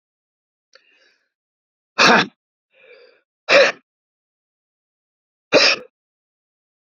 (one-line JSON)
{"exhalation_length": "6.9 s", "exhalation_amplitude": 32768, "exhalation_signal_mean_std_ratio": 0.26, "survey_phase": "beta (2021-08-13 to 2022-03-07)", "age": "45-64", "gender": "Male", "wearing_mask": "No", "symptom_none": true, "smoker_status": "Never smoked", "respiratory_condition_asthma": true, "respiratory_condition_other": false, "recruitment_source": "REACT", "submission_delay": "3 days", "covid_test_result": "Negative", "covid_test_method": "RT-qPCR", "influenza_a_test_result": "Negative", "influenza_b_test_result": "Negative"}